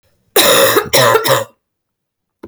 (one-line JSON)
{"cough_length": "2.5 s", "cough_amplitude": 32768, "cough_signal_mean_std_ratio": 0.56, "survey_phase": "beta (2021-08-13 to 2022-03-07)", "age": "18-44", "gender": "Female", "wearing_mask": "No", "symptom_cough_any": true, "symptom_runny_or_blocked_nose": true, "symptom_sore_throat": true, "symptom_onset": "4 days", "smoker_status": "Never smoked", "respiratory_condition_asthma": false, "respiratory_condition_other": false, "recruitment_source": "REACT", "submission_delay": "0 days", "covid_test_result": "Negative", "covid_test_method": "RT-qPCR"}